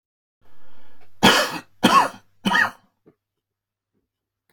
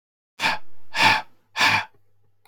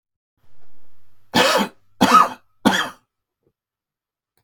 three_cough_length: 4.5 s
three_cough_amplitude: 30102
three_cough_signal_mean_std_ratio: 0.41
exhalation_length: 2.5 s
exhalation_amplitude: 20292
exhalation_signal_mean_std_ratio: 0.56
cough_length: 4.4 s
cough_amplitude: 29206
cough_signal_mean_std_ratio: 0.41
survey_phase: alpha (2021-03-01 to 2021-08-12)
age: 45-64
gender: Male
wearing_mask: 'No'
symptom_none: true
smoker_status: Ex-smoker
respiratory_condition_asthma: false
respiratory_condition_other: false
recruitment_source: REACT
submission_delay: 2 days
covid_test_result: Negative
covid_test_method: RT-qPCR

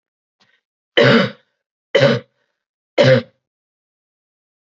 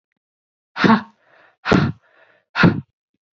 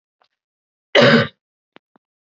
three_cough_length: 4.8 s
three_cough_amplitude: 29007
three_cough_signal_mean_std_ratio: 0.33
exhalation_length: 3.3 s
exhalation_amplitude: 27758
exhalation_signal_mean_std_ratio: 0.35
cough_length: 2.2 s
cough_amplitude: 29228
cough_signal_mean_std_ratio: 0.3
survey_phase: beta (2021-08-13 to 2022-03-07)
age: 18-44
gender: Female
wearing_mask: 'No'
symptom_cough_any: true
symptom_new_continuous_cough: true
symptom_runny_or_blocked_nose: true
symptom_headache: true
symptom_other: true
symptom_onset: 4 days
smoker_status: Never smoked
respiratory_condition_asthma: false
respiratory_condition_other: false
recruitment_source: Test and Trace
submission_delay: 1 day
covid_test_result: Positive
covid_test_method: RT-qPCR
covid_ct_value: 14.9
covid_ct_gene: ORF1ab gene
covid_ct_mean: 15.0
covid_viral_load: 12000000 copies/ml
covid_viral_load_category: High viral load (>1M copies/ml)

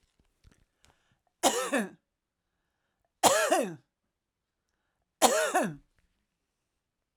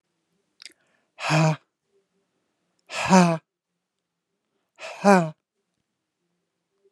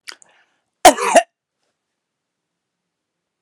three_cough_length: 7.2 s
three_cough_amplitude: 19897
three_cough_signal_mean_std_ratio: 0.33
exhalation_length: 6.9 s
exhalation_amplitude: 28706
exhalation_signal_mean_std_ratio: 0.27
cough_length: 3.4 s
cough_amplitude: 32768
cough_signal_mean_std_ratio: 0.21
survey_phase: alpha (2021-03-01 to 2021-08-12)
age: 45-64
gender: Female
wearing_mask: 'No'
symptom_none: true
smoker_status: Ex-smoker
respiratory_condition_asthma: false
respiratory_condition_other: false
recruitment_source: REACT
submission_delay: 1 day
covid_test_result: Negative
covid_test_method: RT-qPCR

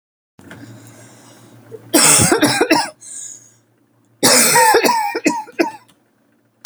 cough_length: 6.7 s
cough_amplitude: 32768
cough_signal_mean_std_ratio: 0.5
survey_phase: alpha (2021-03-01 to 2021-08-12)
age: 18-44
gender: Female
wearing_mask: 'No'
symptom_fatigue: true
smoker_status: Never smoked
respiratory_condition_asthma: false
respiratory_condition_other: false
recruitment_source: REACT
submission_delay: 1 day
covid_test_result: Negative
covid_test_method: RT-qPCR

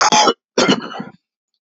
three_cough_length: 1.6 s
three_cough_amplitude: 32767
three_cough_signal_mean_std_ratio: 0.52
survey_phase: beta (2021-08-13 to 2022-03-07)
age: 45-64
gender: Male
wearing_mask: 'No'
symptom_cough_any: true
symptom_runny_or_blocked_nose: true
symptom_sore_throat: true
symptom_fatigue: true
symptom_fever_high_temperature: true
symptom_headache: true
symptom_onset: 3 days
smoker_status: Ex-smoker
respiratory_condition_asthma: false
respiratory_condition_other: false
recruitment_source: Test and Trace
submission_delay: 2 days
covid_test_result: Positive
covid_test_method: RT-qPCR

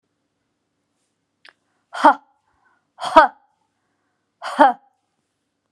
exhalation_length: 5.7 s
exhalation_amplitude: 32768
exhalation_signal_mean_std_ratio: 0.22
survey_phase: alpha (2021-03-01 to 2021-08-12)
age: 45-64
gender: Female
wearing_mask: 'No'
symptom_none: true
smoker_status: Never smoked
respiratory_condition_asthma: false
respiratory_condition_other: false
recruitment_source: REACT
submission_delay: 1 day
covid_test_result: Negative
covid_test_method: RT-qPCR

